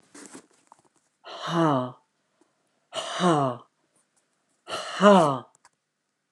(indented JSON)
{
  "exhalation_length": "6.3 s",
  "exhalation_amplitude": 20091,
  "exhalation_signal_mean_std_ratio": 0.36,
  "survey_phase": "alpha (2021-03-01 to 2021-08-12)",
  "age": "65+",
  "gender": "Female",
  "wearing_mask": "No",
  "symptom_none": true,
  "smoker_status": "Ex-smoker",
  "respiratory_condition_asthma": false,
  "respiratory_condition_other": true,
  "recruitment_source": "REACT",
  "submission_delay": "4 days",
  "covid_test_result": "Negative",
  "covid_test_method": "RT-qPCR"
}